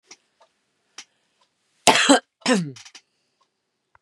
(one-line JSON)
{"cough_length": "4.0 s", "cough_amplitude": 32768, "cough_signal_mean_std_ratio": 0.27, "survey_phase": "beta (2021-08-13 to 2022-03-07)", "age": "45-64", "gender": "Female", "wearing_mask": "No", "symptom_none": true, "smoker_status": "Never smoked", "respiratory_condition_asthma": false, "respiratory_condition_other": false, "recruitment_source": "REACT", "submission_delay": "4 days", "covid_test_result": "Negative", "covid_test_method": "RT-qPCR", "influenza_a_test_result": "Negative", "influenza_b_test_result": "Negative"}